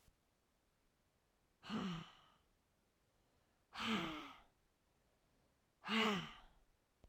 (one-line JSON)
{"exhalation_length": "7.1 s", "exhalation_amplitude": 1986, "exhalation_signal_mean_std_ratio": 0.36, "survey_phase": "alpha (2021-03-01 to 2021-08-12)", "age": "45-64", "gender": "Female", "wearing_mask": "No", "symptom_headache": true, "symptom_onset": "4 days", "smoker_status": "Never smoked", "respiratory_condition_asthma": false, "respiratory_condition_other": false, "recruitment_source": "REACT", "submission_delay": "3 days", "covid_test_result": "Negative", "covid_test_method": "RT-qPCR"}